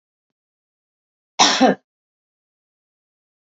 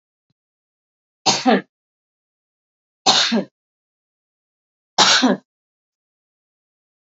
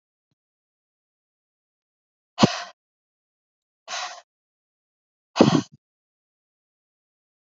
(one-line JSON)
{"cough_length": "3.4 s", "cough_amplitude": 32767, "cough_signal_mean_std_ratio": 0.24, "three_cough_length": "7.1 s", "three_cough_amplitude": 32768, "three_cough_signal_mean_std_ratio": 0.29, "exhalation_length": "7.6 s", "exhalation_amplitude": 27056, "exhalation_signal_mean_std_ratio": 0.17, "survey_phase": "alpha (2021-03-01 to 2021-08-12)", "age": "45-64", "gender": "Female", "wearing_mask": "No", "symptom_none": true, "smoker_status": "Never smoked", "respiratory_condition_asthma": false, "respiratory_condition_other": false, "recruitment_source": "REACT", "submission_delay": "2 days", "covid_test_result": "Negative", "covid_test_method": "RT-qPCR"}